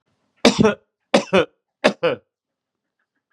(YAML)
three_cough_length: 3.3 s
three_cough_amplitude: 32767
three_cough_signal_mean_std_ratio: 0.33
survey_phase: beta (2021-08-13 to 2022-03-07)
age: 45-64
gender: Male
wearing_mask: 'No'
symptom_none: true
smoker_status: Current smoker (1 to 10 cigarettes per day)
respiratory_condition_asthma: false
respiratory_condition_other: false
recruitment_source: REACT
submission_delay: 2 days
covid_test_result: Negative
covid_test_method: RT-qPCR